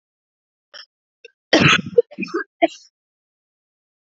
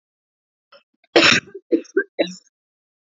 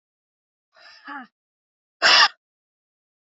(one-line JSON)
{"cough_length": "4.0 s", "cough_amplitude": 30466, "cough_signal_mean_std_ratio": 0.28, "three_cough_length": "3.1 s", "three_cough_amplitude": 30026, "three_cough_signal_mean_std_ratio": 0.3, "exhalation_length": "3.2 s", "exhalation_amplitude": 25704, "exhalation_signal_mean_std_ratio": 0.24, "survey_phase": "alpha (2021-03-01 to 2021-08-12)", "age": "18-44", "gender": "Female", "wearing_mask": "No", "symptom_cough_any": true, "symptom_new_continuous_cough": true, "symptom_shortness_of_breath": true, "symptom_diarrhoea": true, "symptom_fatigue": true, "symptom_fever_high_temperature": true, "symptom_headache": true, "symptom_change_to_sense_of_smell_or_taste": true, "symptom_loss_of_taste": true, "symptom_onset": "3 days", "smoker_status": "Ex-smoker", "respiratory_condition_asthma": false, "respiratory_condition_other": false, "recruitment_source": "Test and Trace", "submission_delay": "2 days", "covid_test_result": "Positive", "covid_test_method": "RT-qPCR"}